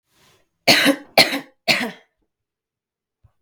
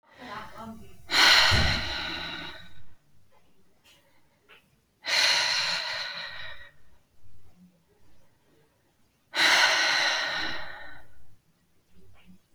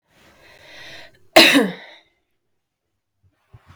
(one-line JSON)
{"three_cough_length": "3.4 s", "three_cough_amplitude": 32768, "three_cough_signal_mean_std_ratio": 0.33, "exhalation_length": "12.5 s", "exhalation_amplitude": 18584, "exhalation_signal_mean_std_ratio": 0.51, "cough_length": "3.8 s", "cough_amplitude": 32768, "cough_signal_mean_std_ratio": 0.25, "survey_phase": "beta (2021-08-13 to 2022-03-07)", "age": "18-44", "gender": "Female", "wearing_mask": "No", "symptom_fatigue": true, "symptom_onset": "12 days", "smoker_status": "Prefer not to say", "respiratory_condition_asthma": false, "respiratory_condition_other": false, "recruitment_source": "REACT", "submission_delay": "1 day", "covid_test_result": "Negative", "covid_test_method": "RT-qPCR", "influenza_a_test_result": "Negative", "influenza_b_test_result": "Negative"}